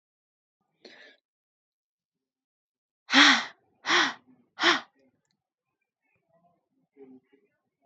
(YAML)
exhalation_length: 7.9 s
exhalation_amplitude: 21465
exhalation_signal_mean_std_ratio: 0.24
survey_phase: beta (2021-08-13 to 2022-03-07)
age: 18-44
gender: Female
wearing_mask: 'No'
symptom_none: true
smoker_status: Never smoked
respiratory_condition_asthma: false
respiratory_condition_other: false
recruitment_source: REACT
submission_delay: 2 days
covid_test_result: Negative
covid_test_method: RT-qPCR
influenza_a_test_result: Negative
influenza_b_test_result: Negative